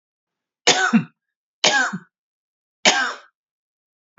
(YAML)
three_cough_length: 4.2 s
three_cough_amplitude: 31653
three_cough_signal_mean_std_ratio: 0.36
survey_phase: beta (2021-08-13 to 2022-03-07)
age: 18-44
gender: Female
wearing_mask: 'No'
symptom_runny_or_blocked_nose: true
symptom_sore_throat: true
symptom_onset: 3 days
smoker_status: Ex-smoker
respiratory_condition_asthma: false
respiratory_condition_other: false
recruitment_source: REACT
submission_delay: 0 days
covid_test_result: Negative
covid_test_method: RT-qPCR
influenza_a_test_result: Negative
influenza_b_test_result: Negative